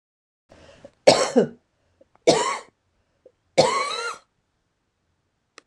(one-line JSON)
{"three_cough_length": "5.7 s", "three_cough_amplitude": 26028, "three_cough_signal_mean_std_ratio": 0.32, "survey_phase": "beta (2021-08-13 to 2022-03-07)", "age": "65+", "gender": "Female", "wearing_mask": "No", "symptom_runny_or_blocked_nose": true, "symptom_change_to_sense_of_smell_or_taste": true, "symptom_onset": "12 days", "smoker_status": "Ex-smoker", "respiratory_condition_asthma": false, "respiratory_condition_other": false, "recruitment_source": "REACT", "submission_delay": "2 days", "covid_test_result": "Negative", "covid_test_method": "RT-qPCR"}